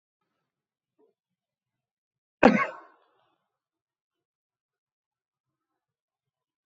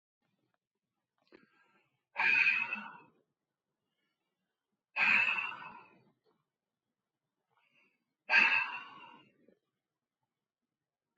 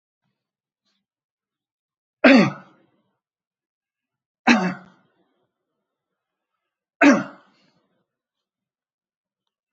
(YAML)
cough_length: 6.7 s
cough_amplitude: 26951
cough_signal_mean_std_ratio: 0.13
exhalation_length: 11.2 s
exhalation_amplitude: 7895
exhalation_signal_mean_std_ratio: 0.31
three_cough_length: 9.7 s
three_cough_amplitude: 27875
three_cough_signal_mean_std_ratio: 0.21
survey_phase: beta (2021-08-13 to 2022-03-07)
age: 65+
gender: Male
wearing_mask: 'No'
symptom_none: true
smoker_status: Ex-smoker
respiratory_condition_asthma: false
respiratory_condition_other: false
recruitment_source: REACT
submission_delay: 2 days
covid_test_result: Negative
covid_test_method: RT-qPCR
influenza_a_test_result: Negative
influenza_b_test_result: Negative